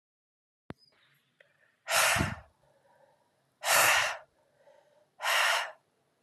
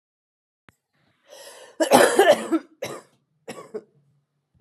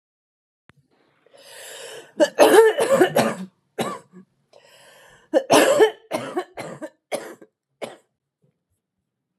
{
  "exhalation_length": "6.2 s",
  "exhalation_amplitude": 11115,
  "exhalation_signal_mean_std_ratio": 0.39,
  "cough_length": "4.6 s",
  "cough_amplitude": 30476,
  "cough_signal_mean_std_ratio": 0.32,
  "three_cough_length": "9.4 s",
  "three_cough_amplitude": 31272,
  "three_cough_signal_mean_std_ratio": 0.36,
  "survey_phase": "beta (2021-08-13 to 2022-03-07)",
  "age": "45-64",
  "gender": "Female",
  "wearing_mask": "No",
  "symptom_cough_any": true,
  "symptom_runny_or_blocked_nose": true,
  "symptom_onset": "12 days",
  "smoker_status": "Never smoked",
  "respiratory_condition_asthma": false,
  "respiratory_condition_other": false,
  "recruitment_source": "REACT",
  "submission_delay": "1 day",
  "covid_test_result": "Negative",
  "covid_test_method": "RT-qPCR",
  "influenza_a_test_result": "Negative",
  "influenza_b_test_result": "Negative"
}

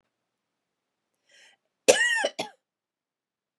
{
  "cough_length": "3.6 s",
  "cough_amplitude": 26235,
  "cough_signal_mean_std_ratio": 0.25,
  "survey_phase": "beta (2021-08-13 to 2022-03-07)",
  "age": "45-64",
  "gender": "Female",
  "wearing_mask": "No",
  "symptom_none": true,
  "smoker_status": "Ex-smoker",
  "respiratory_condition_asthma": false,
  "respiratory_condition_other": false,
  "recruitment_source": "REACT",
  "submission_delay": "1 day",
  "covid_test_result": "Negative",
  "covid_test_method": "RT-qPCR"
}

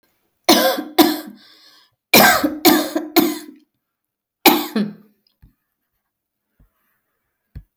{
  "cough_length": "7.8 s",
  "cough_amplitude": 32768,
  "cough_signal_mean_std_ratio": 0.37,
  "survey_phase": "beta (2021-08-13 to 2022-03-07)",
  "age": "45-64",
  "gender": "Female",
  "wearing_mask": "No",
  "symptom_none": true,
  "smoker_status": "Ex-smoker",
  "respiratory_condition_asthma": false,
  "respiratory_condition_other": false,
  "recruitment_source": "REACT",
  "submission_delay": "5 days",
  "covid_test_result": "Negative",
  "covid_test_method": "RT-qPCR",
  "influenza_a_test_result": "Negative",
  "influenza_b_test_result": "Negative"
}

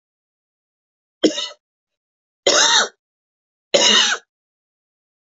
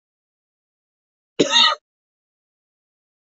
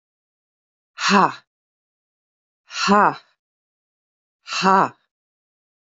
{
  "three_cough_length": "5.2 s",
  "three_cough_amplitude": 31842,
  "three_cough_signal_mean_std_ratio": 0.35,
  "cough_length": "3.3 s",
  "cough_amplitude": 24987,
  "cough_signal_mean_std_ratio": 0.24,
  "exhalation_length": "5.8 s",
  "exhalation_amplitude": 26019,
  "exhalation_signal_mean_std_ratio": 0.29,
  "survey_phase": "beta (2021-08-13 to 2022-03-07)",
  "age": "45-64",
  "gender": "Female",
  "wearing_mask": "No",
  "symptom_none": true,
  "smoker_status": "Current smoker (e-cigarettes or vapes only)",
  "respiratory_condition_asthma": false,
  "respiratory_condition_other": false,
  "recruitment_source": "REACT",
  "submission_delay": "4 days",
  "covid_test_result": "Negative",
  "covid_test_method": "RT-qPCR",
  "influenza_a_test_result": "Negative",
  "influenza_b_test_result": "Negative"
}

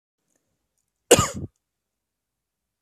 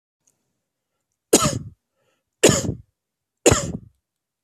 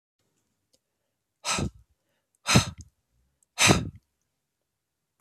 {
  "cough_length": "2.8 s",
  "cough_amplitude": 27412,
  "cough_signal_mean_std_ratio": 0.18,
  "three_cough_length": "4.4 s",
  "three_cough_amplitude": 31522,
  "three_cough_signal_mean_std_ratio": 0.29,
  "exhalation_length": "5.2 s",
  "exhalation_amplitude": 21587,
  "exhalation_signal_mean_std_ratio": 0.26,
  "survey_phase": "beta (2021-08-13 to 2022-03-07)",
  "age": "45-64",
  "gender": "Male",
  "wearing_mask": "No",
  "symptom_headache": true,
  "smoker_status": "Prefer not to say",
  "respiratory_condition_asthma": false,
  "respiratory_condition_other": false,
  "recruitment_source": "REACT",
  "submission_delay": "4 days",
  "covid_test_result": "Negative",
  "covid_test_method": "RT-qPCR",
  "influenza_a_test_result": "Negative",
  "influenza_b_test_result": "Negative"
}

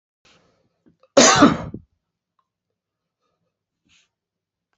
{
  "cough_length": "4.8 s",
  "cough_amplitude": 30061,
  "cough_signal_mean_std_ratio": 0.23,
  "survey_phase": "beta (2021-08-13 to 2022-03-07)",
  "age": "65+",
  "gender": "Male",
  "wearing_mask": "No",
  "symptom_none": true,
  "symptom_onset": "12 days",
  "smoker_status": "Ex-smoker",
  "respiratory_condition_asthma": false,
  "respiratory_condition_other": false,
  "recruitment_source": "REACT",
  "submission_delay": "5 days",
  "covid_test_result": "Negative",
  "covid_test_method": "RT-qPCR"
}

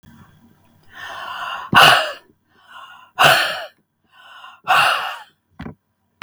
{
  "exhalation_length": "6.2 s",
  "exhalation_amplitude": 32768,
  "exhalation_signal_mean_std_ratio": 0.38,
  "survey_phase": "beta (2021-08-13 to 2022-03-07)",
  "age": "65+",
  "gender": "Female",
  "wearing_mask": "No",
  "symptom_none": true,
  "smoker_status": "Never smoked",
  "respiratory_condition_asthma": false,
  "respiratory_condition_other": false,
  "recruitment_source": "REACT",
  "submission_delay": "1 day",
  "covid_test_result": "Negative",
  "covid_test_method": "RT-qPCR"
}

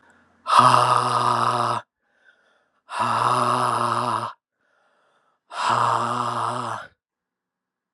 {
  "exhalation_length": "7.9 s",
  "exhalation_amplitude": 30743,
  "exhalation_signal_mean_std_ratio": 0.57,
  "survey_phase": "alpha (2021-03-01 to 2021-08-12)",
  "age": "18-44",
  "gender": "Male",
  "wearing_mask": "No",
  "symptom_cough_any": true,
  "symptom_abdominal_pain": true,
  "symptom_diarrhoea": true,
  "symptom_fatigue": true,
  "symptom_fever_high_temperature": true,
  "symptom_change_to_sense_of_smell_or_taste": true,
  "symptom_loss_of_taste": true,
  "smoker_status": "Never smoked",
  "respiratory_condition_asthma": false,
  "respiratory_condition_other": false,
  "recruitment_source": "Test and Trace",
  "submission_delay": "2 days",
  "covid_test_result": "Positive",
  "covid_test_method": "RT-qPCR",
  "covid_ct_value": 14.1,
  "covid_ct_gene": "ORF1ab gene",
  "covid_ct_mean": 14.5,
  "covid_viral_load": "18000000 copies/ml",
  "covid_viral_load_category": "High viral load (>1M copies/ml)"
}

